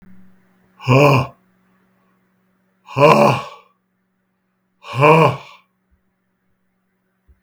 {"exhalation_length": "7.4 s", "exhalation_amplitude": 32766, "exhalation_signal_mean_std_ratio": 0.33, "survey_phase": "beta (2021-08-13 to 2022-03-07)", "age": "65+", "gender": "Male", "wearing_mask": "No", "symptom_cough_any": true, "smoker_status": "Ex-smoker", "respiratory_condition_asthma": false, "respiratory_condition_other": false, "recruitment_source": "REACT", "submission_delay": "3 days", "covid_test_result": "Negative", "covid_test_method": "RT-qPCR", "influenza_a_test_result": "Negative", "influenza_b_test_result": "Negative"}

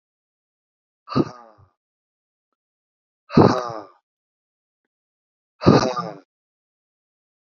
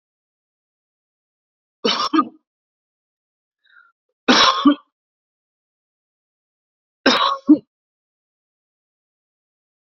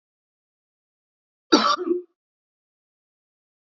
{"exhalation_length": "7.6 s", "exhalation_amplitude": 28800, "exhalation_signal_mean_std_ratio": 0.23, "three_cough_length": "10.0 s", "three_cough_amplitude": 29891, "three_cough_signal_mean_std_ratio": 0.25, "cough_length": "3.8 s", "cough_amplitude": 27849, "cough_signal_mean_std_ratio": 0.24, "survey_phase": "beta (2021-08-13 to 2022-03-07)", "age": "45-64", "gender": "Male", "wearing_mask": "No", "symptom_none": true, "smoker_status": "Ex-smoker", "respiratory_condition_asthma": false, "respiratory_condition_other": false, "recruitment_source": "REACT", "submission_delay": "3 days", "covid_test_result": "Negative", "covid_test_method": "RT-qPCR", "influenza_a_test_result": "Negative", "influenza_b_test_result": "Negative"}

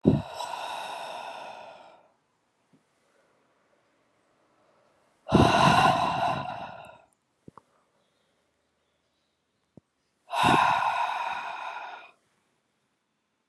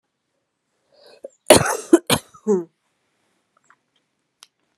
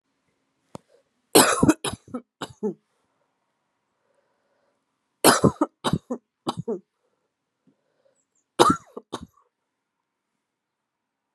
{"exhalation_length": "13.5 s", "exhalation_amplitude": 16724, "exhalation_signal_mean_std_ratio": 0.38, "cough_length": "4.8 s", "cough_amplitude": 32768, "cough_signal_mean_std_ratio": 0.23, "three_cough_length": "11.3 s", "three_cough_amplitude": 32767, "three_cough_signal_mean_std_ratio": 0.24, "survey_phase": "beta (2021-08-13 to 2022-03-07)", "age": "18-44", "gender": "Female", "wearing_mask": "No", "symptom_cough_any": true, "symptom_runny_or_blocked_nose": true, "symptom_sore_throat": true, "symptom_fatigue": true, "symptom_headache": true, "symptom_onset": "3 days", "smoker_status": "Never smoked", "respiratory_condition_asthma": false, "respiratory_condition_other": false, "recruitment_source": "Test and Trace", "submission_delay": "1 day", "covid_test_result": "Positive", "covid_test_method": "RT-qPCR", "covid_ct_value": 21.3, "covid_ct_gene": "ORF1ab gene", "covid_ct_mean": 21.8, "covid_viral_load": "71000 copies/ml", "covid_viral_load_category": "Low viral load (10K-1M copies/ml)"}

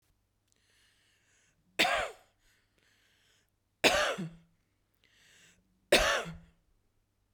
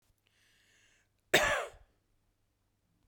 {"three_cough_length": "7.3 s", "three_cough_amplitude": 11717, "three_cough_signal_mean_std_ratio": 0.29, "cough_length": "3.1 s", "cough_amplitude": 9028, "cough_signal_mean_std_ratio": 0.25, "survey_phase": "beta (2021-08-13 to 2022-03-07)", "age": "45-64", "gender": "Female", "wearing_mask": "No", "symptom_sore_throat": true, "symptom_onset": "8 days", "smoker_status": "Never smoked", "respiratory_condition_asthma": true, "respiratory_condition_other": false, "recruitment_source": "REACT", "submission_delay": "1 day", "covid_test_result": "Negative", "covid_test_method": "RT-qPCR", "influenza_a_test_result": "Negative", "influenza_b_test_result": "Negative"}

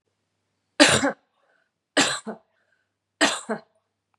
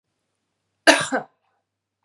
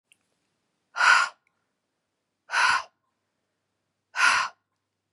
{"three_cough_length": "4.2 s", "three_cough_amplitude": 32752, "three_cough_signal_mean_std_ratio": 0.31, "cough_length": "2.0 s", "cough_amplitude": 32767, "cough_signal_mean_std_ratio": 0.24, "exhalation_length": "5.1 s", "exhalation_amplitude": 16408, "exhalation_signal_mean_std_ratio": 0.33, "survey_phase": "beta (2021-08-13 to 2022-03-07)", "age": "45-64", "gender": "Female", "wearing_mask": "No", "symptom_none": true, "symptom_onset": "11 days", "smoker_status": "Never smoked", "respiratory_condition_asthma": false, "respiratory_condition_other": false, "recruitment_source": "REACT", "submission_delay": "2 days", "covid_test_result": "Negative", "covid_test_method": "RT-qPCR", "influenza_a_test_result": "Unknown/Void", "influenza_b_test_result": "Unknown/Void"}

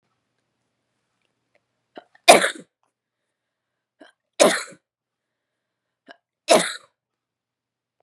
{"three_cough_length": "8.0 s", "three_cough_amplitude": 32768, "three_cough_signal_mean_std_ratio": 0.19, "survey_phase": "beta (2021-08-13 to 2022-03-07)", "age": "18-44", "gender": "Female", "wearing_mask": "No", "symptom_cough_any": true, "symptom_runny_or_blocked_nose": true, "symptom_sore_throat": true, "symptom_abdominal_pain": true, "symptom_fatigue": true, "smoker_status": "Never smoked", "respiratory_condition_asthma": false, "respiratory_condition_other": false, "recruitment_source": "Test and Trace", "submission_delay": "2 days", "covid_test_result": "Positive", "covid_test_method": "RT-qPCR", "covid_ct_value": 17.9, "covid_ct_gene": "ORF1ab gene", "covid_ct_mean": 18.2, "covid_viral_load": "1100000 copies/ml", "covid_viral_load_category": "High viral load (>1M copies/ml)"}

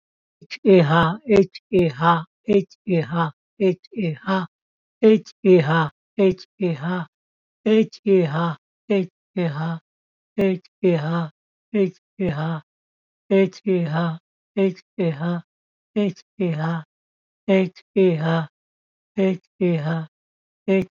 {"exhalation_length": "20.9 s", "exhalation_amplitude": 23953, "exhalation_signal_mean_std_ratio": 0.55, "survey_phase": "beta (2021-08-13 to 2022-03-07)", "age": "65+", "gender": "Male", "wearing_mask": "No", "symptom_cough_any": true, "symptom_runny_or_blocked_nose": true, "symptom_sore_throat": true, "symptom_abdominal_pain": true, "symptom_headache": true, "symptom_onset": "12 days", "smoker_status": "Ex-smoker", "respiratory_condition_asthma": false, "respiratory_condition_other": false, "recruitment_source": "REACT", "submission_delay": "3 days", "covid_test_result": "Negative", "covid_test_method": "RT-qPCR", "influenza_a_test_result": "Negative", "influenza_b_test_result": "Negative"}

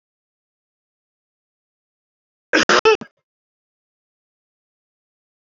{"cough_length": "5.5 s", "cough_amplitude": 27078, "cough_signal_mean_std_ratio": 0.19, "survey_phase": "alpha (2021-03-01 to 2021-08-12)", "age": "65+", "gender": "Male", "wearing_mask": "No", "symptom_none": true, "smoker_status": "Ex-smoker", "respiratory_condition_asthma": false, "respiratory_condition_other": false, "recruitment_source": "REACT", "submission_delay": "8 days", "covid_test_result": "Negative", "covid_test_method": "RT-qPCR"}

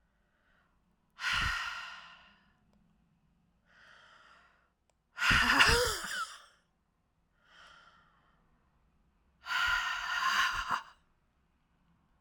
{"exhalation_length": "12.2 s", "exhalation_amplitude": 11712, "exhalation_signal_mean_std_ratio": 0.39, "survey_phase": "alpha (2021-03-01 to 2021-08-12)", "age": "45-64", "gender": "Female", "wearing_mask": "No", "symptom_cough_any": true, "symptom_fatigue": true, "symptom_headache": true, "smoker_status": "Ex-smoker", "respiratory_condition_asthma": false, "respiratory_condition_other": false, "recruitment_source": "Test and Trace", "submission_delay": "1 day", "covid_test_result": "Positive", "covid_test_method": "LFT"}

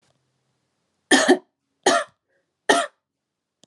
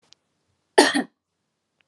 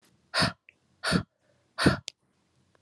{"three_cough_length": "3.7 s", "three_cough_amplitude": 31352, "three_cough_signal_mean_std_ratio": 0.31, "cough_length": "1.9 s", "cough_amplitude": 32479, "cough_signal_mean_std_ratio": 0.24, "exhalation_length": "2.8 s", "exhalation_amplitude": 16376, "exhalation_signal_mean_std_ratio": 0.33, "survey_phase": "alpha (2021-03-01 to 2021-08-12)", "age": "18-44", "gender": "Female", "wearing_mask": "No", "symptom_none": true, "smoker_status": "Never smoked", "respiratory_condition_asthma": false, "respiratory_condition_other": false, "recruitment_source": "REACT", "submission_delay": "1 day", "covid_test_result": "Negative", "covid_test_method": "RT-qPCR"}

